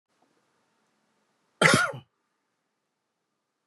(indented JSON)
{
  "cough_length": "3.7 s",
  "cough_amplitude": 22242,
  "cough_signal_mean_std_ratio": 0.22,
  "survey_phase": "beta (2021-08-13 to 2022-03-07)",
  "age": "45-64",
  "gender": "Male",
  "wearing_mask": "No",
  "symptom_none": true,
  "smoker_status": "Ex-smoker",
  "respiratory_condition_asthma": false,
  "respiratory_condition_other": false,
  "recruitment_source": "REACT",
  "submission_delay": "2 days",
  "covid_test_result": "Negative",
  "covid_test_method": "RT-qPCR"
}